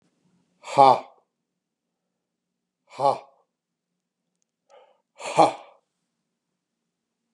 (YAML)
exhalation_length: 7.3 s
exhalation_amplitude: 28855
exhalation_signal_mean_std_ratio: 0.2
survey_phase: beta (2021-08-13 to 2022-03-07)
age: 45-64
gender: Male
wearing_mask: 'No'
symptom_none: true
symptom_onset: 13 days
smoker_status: Ex-smoker
respiratory_condition_asthma: false
respiratory_condition_other: false
recruitment_source: REACT
submission_delay: 3 days
covid_test_result: Negative
covid_test_method: RT-qPCR
influenza_a_test_result: Negative
influenza_b_test_result: Negative